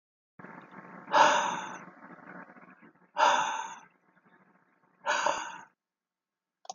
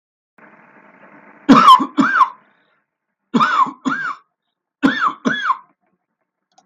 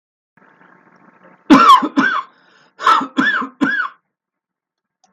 {
  "exhalation_length": "6.7 s",
  "exhalation_amplitude": 11664,
  "exhalation_signal_mean_std_ratio": 0.38,
  "three_cough_length": "6.7 s",
  "three_cough_amplitude": 32768,
  "three_cough_signal_mean_std_ratio": 0.4,
  "cough_length": "5.1 s",
  "cough_amplitude": 32768,
  "cough_signal_mean_std_ratio": 0.41,
  "survey_phase": "beta (2021-08-13 to 2022-03-07)",
  "age": "45-64",
  "gender": "Male",
  "wearing_mask": "No",
  "symptom_none": true,
  "smoker_status": "Never smoked",
  "respiratory_condition_asthma": false,
  "respiratory_condition_other": false,
  "recruitment_source": "REACT",
  "submission_delay": "4 days",
  "covid_test_result": "Negative",
  "covid_test_method": "RT-qPCR",
  "influenza_a_test_result": "Negative",
  "influenza_b_test_result": "Negative"
}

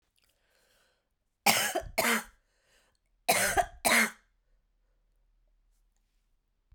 {
  "cough_length": "6.7 s",
  "cough_amplitude": 14620,
  "cough_signal_mean_std_ratio": 0.33,
  "survey_phase": "beta (2021-08-13 to 2022-03-07)",
  "age": "45-64",
  "gender": "Female",
  "wearing_mask": "No",
  "symptom_cough_any": true,
  "symptom_runny_or_blocked_nose": true,
  "symptom_headache": true,
  "symptom_onset": "3 days",
  "smoker_status": "Never smoked",
  "respiratory_condition_asthma": false,
  "respiratory_condition_other": false,
  "recruitment_source": "Test and Trace",
  "submission_delay": "2 days",
  "covid_test_result": "Positive",
  "covid_test_method": "RT-qPCR",
  "covid_ct_value": 15.3,
  "covid_ct_gene": "N gene",
  "covid_ct_mean": 15.4,
  "covid_viral_load": "9100000 copies/ml",
  "covid_viral_load_category": "High viral load (>1M copies/ml)"
}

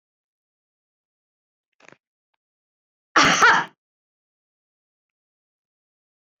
{
  "cough_length": "6.4 s",
  "cough_amplitude": 23273,
  "cough_signal_mean_std_ratio": 0.21,
  "survey_phase": "beta (2021-08-13 to 2022-03-07)",
  "age": "45-64",
  "gender": "Female",
  "wearing_mask": "No",
  "symptom_none": true,
  "smoker_status": "Never smoked",
  "respiratory_condition_asthma": false,
  "respiratory_condition_other": false,
  "recruitment_source": "REACT",
  "submission_delay": "3 days",
  "covid_test_result": "Negative",
  "covid_test_method": "RT-qPCR"
}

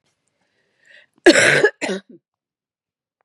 {
  "cough_length": "3.2 s",
  "cough_amplitude": 32768,
  "cough_signal_mean_std_ratio": 0.31,
  "survey_phase": "beta (2021-08-13 to 2022-03-07)",
  "age": "45-64",
  "gender": "Female",
  "wearing_mask": "No",
  "symptom_cough_any": true,
  "symptom_new_continuous_cough": true,
  "symptom_runny_or_blocked_nose": true,
  "symptom_fatigue": true,
  "symptom_change_to_sense_of_smell_or_taste": true,
  "symptom_onset": "3 days",
  "smoker_status": "Ex-smoker",
  "respiratory_condition_asthma": false,
  "respiratory_condition_other": false,
  "recruitment_source": "Test and Trace",
  "submission_delay": "2 days",
  "covid_test_result": "Positive",
  "covid_test_method": "RT-qPCR",
  "covid_ct_value": 21.6,
  "covid_ct_gene": "ORF1ab gene",
  "covid_ct_mean": 22.1,
  "covid_viral_load": "57000 copies/ml",
  "covid_viral_load_category": "Low viral load (10K-1M copies/ml)"
}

